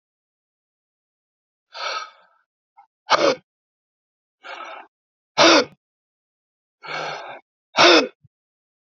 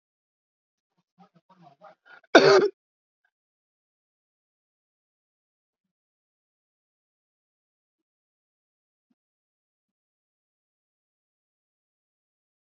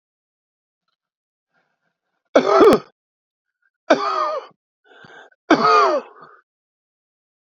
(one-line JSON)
{"exhalation_length": "9.0 s", "exhalation_amplitude": 29357, "exhalation_signal_mean_std_ratio": 0.27, "cough_length": "12.7 s", "cough_amplitude": 32167, "cough_signal_mean_std_ratio": 0.12, "three_cough_length": "7.4 s", "three_cough_amplitude": 32767, "three_cough_signal_mean_std_ratio": 0.33, "survey_phase": "beta (2021-08-13 to 2022-03-07)", "age": "45-64", "gender": "Male", "wearing_mask": "No", "symptom_cough_any": true, "symptom_runny_or_blocked_nose": true, "symptom_sore_throat": true, "symptom_fatigue": true, "symptom_fever_high_temperature": true, "symptom_headache": true, "symptom_change_to_sense_of_smell_or_taste": true, "symptom_onset": "3 days", "smoker_status": "Ex-smoker", "respiratory_condition_asthma": false, "respiratory_condition_other": true, "recruitment_source": "Test and Trace", "submission_delay": "2 days", "covid_test_result": "Positive", "covid_test_method": "RT-qPCR", "covid_ct_value": 25.0, "covid_ct_gene": "ORF1ab gene"}